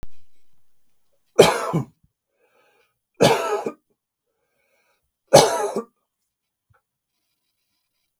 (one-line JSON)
{"three_cough_length": "8.2 s", "three_cough_amplitude": 32768, "three_cough_signal_mean_std_ratio": 0.29, "survey_phase": "beta (2021-08-13 to 2022-03-07)", "age": "65+", "gender": "Male", "wearing_mask": "No", "symptom_none": true, "symptom_onset": "12 days", "smoker_status": "Never smoked", "respiratory_condition_asthma": false, "respiratory_condition_other": false, "recruitment_source": "REACT", "submission_delay": "1 day", "covid_test_result": "Negative", "covid_test_method": "RT-qPCR"}